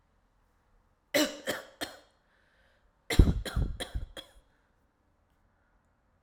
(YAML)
cough_length: 6.2 s
cough_amplitude: 16753
cough_signal_mean_std_ratio: 0.27
survey_phase: alpha (2021-03-01 to 2021-08-12)
age: 18-44
gender: Male
wearing_mask: 'No'
symptom_cough_any: true
symptom_fatigue: true
symptom_change_to_sense_of_smell_or_taste: true
symptom_loss_of_taste: true
symptom_onset: 4 days
smoker_status: Never smoked
respiratory_condition_asthma: false
respiratory_condition_other: false
recruitment_source: Test and Trace
submission_delay: 2 days
covid_test_result: Positive
covid_test_method: RT-qPCR